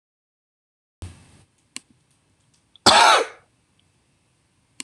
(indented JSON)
{
  "cough_length": "4.8 s",
  "cough_amplitude": 26027,
  "cough_signal_mean_std_ratio": 0.24,
  "survey_phase": "beta (2021-08-13 to 2022-03-07)",
  "age": "45-64",
  "gender": "Male",
  "wearing_mask": "No",
  "symptom_fatigue": true,
  "smoker_status": "Never smoked",
  "respiratory_condition_asthma": false,
  "respiratory_condition_other": false,
  "recruitment_source": "REACT",
  "submission_delay": "1 day",
  "covid_test_result": "Negative",
  "covid_test_method": "RT-qPCR",
  "influenza_a_test_result": "Unknown/Void",
  "influenza_b_test_result": "Unknown/Void"
}